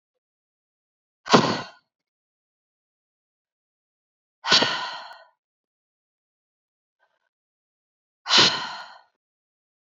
exhalation_length: 9.8 s
exhalation_amplitude: 27108
exhalation_signal_mean_std_ratio: 0.24
survey_phase: beta (2021-08-13 to 2022-03-07)
age: 18-44
gender: Female
wearing_mask: 'No'
symptom_cough_any: true
symptom_runny_or_blocked_nose: true
symptom_change_to_sense_of_smell_or_taste: true
symptom_onset: 4 days
smoker_status: Never smoked
respiratory_condition_asthma: true
respiratory_condition_other: false
recruitment_source: REACT
submission_delay: 4 days
covid_test_result: Positive
covid_test_method: RT-qPCR
covid_ct_value: 24.9
covid_ct_gene: N gene
influenza_a_test_result: Negative
influenza_b_test_result: Negative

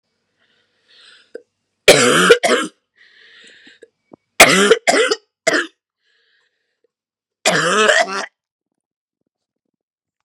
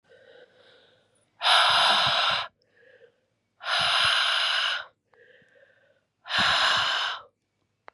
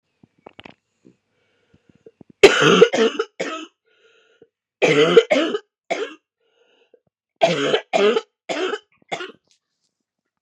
three_cough_length: 10.2 s
three_cough_amplitude: 32768
three_cough_signal_mean_std_ratio: 0.36
exhalation_length: 7.9 s
exhalation_amplitude: 13929
exhalation_signal_mean_std_ratio: 0.55
cough_length: 10.4 s
cough_amplitude: 32768
cough_signal_mean_std_ratio: 0.36
survey_phase: beta (2021-08-13 to 2022-03-07)
age: 18-44
gender: Female
wearing_mask: 'No'
symptom_cough_any: true
symptom_runny_or_blocked_nose: true
symptom_shortness_of_breath: true
symptom_sore_throat: true
symptom_abdominal_pain: true
symptom_fatigue: true
symptom_headache: true
symptom_onset: 6 days
smoker_status: Never smoked
respiratory_condition_asthma: false
respiratory_condition_other: false
recruitment_source: Test and Trace
submission_delay: 3 days
covid_test_result: Positive
covid_test_method: RT-qPCR
covid_ct_value: 25.1
covid_ct_gene: ORF1ab gene
covid_ct_mean: 25.3
covid_viral_load: 5000 copies/ml
covid_viral_load_category: Minimal viral load (< 10K copies/ml)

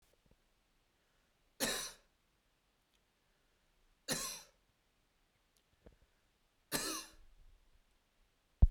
three_cough_length: 8.7 s
three_cough_amplitude: 6821
three_cough_signal_mean_std_ratio: 0.19
survey_phase: beta (2021-08-13 to 2022-03-07)
age: 18-44
gender: Male
wearing_mask: 'No'
symptom_none: true
smoker_status: Never smoked
respiratory_condition_asthma: false
respiratory_condition_other: false
recruitment_source: REACT
submission_delay: 2 days
covid_test_result: Negative
covid_test_method: RT-qPCR
influenza_a_test_result: Unknown/Void
influenza_b_test_result: Unknown/Void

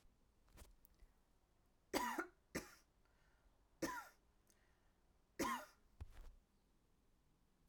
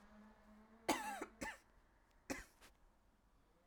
three_cough_length: 7.7 s
three_cough_amplitude: 1741
three_cough_signal_mean_std_ratio: 0.34
cough_length: 3.7 s
cough_amplitude: 2118
cough_signal_mean_std_ratio: 0.38
survey_phase: alpha (2021-03-01 to 2021-08-12)
age: 18-44
gender: Female
wearing_mask: 'No'
symptom_cough_any: true
symptom_fatigue: true
symptom_headache: true
symptom_change_to_sense_of_smell_or_taste: true
symptom_onset: 6 days
smoker_status: Never smoked
respiratory_condition_asthma: false
respiratory_condition_other: false
recruitment_source: Test and Trace
submission_delay: 1 day
covid_test_result: Positive
covid_test_method: RT-qPCR
covid_ct_value: 23.7
covid_ct_gene: ORF1ab gene
covid_ct_mean: 24.3
covid_viral_load: 11000 copies/ml
covid_viral_load_category: Low viral load (10K-1M copies/ml)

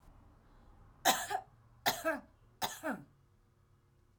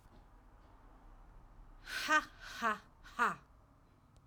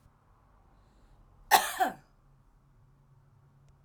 three_cough_length: 4.2 s
three_cough_amplitude: 8091
three_cough_signal_mean_std_ratio: 0.37
exhalation_length: 4.3 s
exhalation_amplitude: 4642
exhalation_signal_mean_std_ratio: 0.38
cough_length: 3.8 s
cough_amplitude: 15891
cough_signal_mean_std_ratio: 0.23
survey_phase: alpha (2021-03-01 to 2021-08-12)
age: 45-64
gender: Female
wearing_mask: 'No'
symptom_change_to_sense_of_smell_or_taste: true
smoker_status: Ex-smoker
respiratory_condition_asthma: false
respiratory_condition_other: false
recruitment_source: REACT
submission_delay: 1 day
covid_test_result: Negative
covid_test_method: RT-qPCR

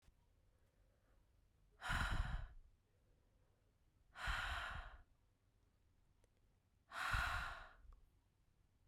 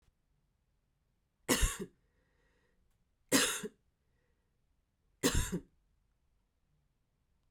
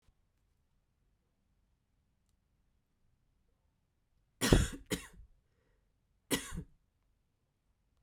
exhalation_length: 8.9 s
exhalation_amplitude: 1379
exhalation_signal_mean_std_ratio: 0.43
three_cough_length: 7.5 s
three_cough_amplitude: 6635
three_cough_signal_mean_std_ratio: 0.27
cough_length: 8.0 s
cough_amplitude: 12316
cough_signal_mean_std_ratio: 0.19
survey_phase: beta (2021-08-13 to 2022-03-07)
age: 18-44
gender: Female
wearing_mask: 'No'
symptom_cough_any: true
symptom_runny_or_blocked_nose: true
symptom_sore_throat: true
symptom_abdominal_pain: true
symptom_fatigue: true
symptom_headache: true
symptom_onset: 5 days
smoker_status: Never smoked
respiratory_condition_asthma: false
respiratory_condition_other: false
recruitment_source: Test and Trace
submission_delay: 2 days
covid_test_result: Positive
covid_test_method: RT-qPCR
covid_ct_value: 16.4
covid_ct_gene: N gene
covid_ct_mean: 17.6
covid_viral_load: 1700000 copies/ml
covid_viral_load_category: High viral load (>1M copies/ml)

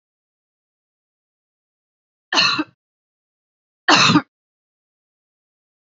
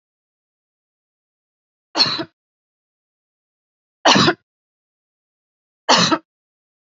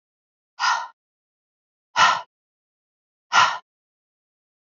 cough_length: 6.0 s
cough_amplitude: 28703
cough_signal_mean_std_ratio: 0.25
three_cough_length: 7.0 s
three_cough_amplitude: 31303
three_cough_signal_mean_std_ratio: 0.26
exhalation_length: 4.8 s
exhalation_amplitude: 25204
exhalation_signal_mean_std_ratio: 0.28
survey_phase: beta (2021-08-13 to 2022-03-07)
age: 45-64
gender: Female
wearing_mask: 'No'
symptom_cough_any: true
symptom_runny_or_blocked_nose: true
symptom_shortness_of_breath: true
symptom_sore_throat: true
symptom_diarrhoea: true
symptom_fatigue: true
symptom_headache: true
symptom_change_to_sense_of_smell_or_taste: true
symptom_loss_of_taste: true
symptom_onset: 2 days
smoker_status: Current smoker (e-cigarettes or vapes only)
respiratory_condition_asthma: false
respiratory_condition_other: false
recruitment_source: Test and Trace
submission_delay: 1 day
covid_test_result: Positive
covid_test_method: RT-qPCR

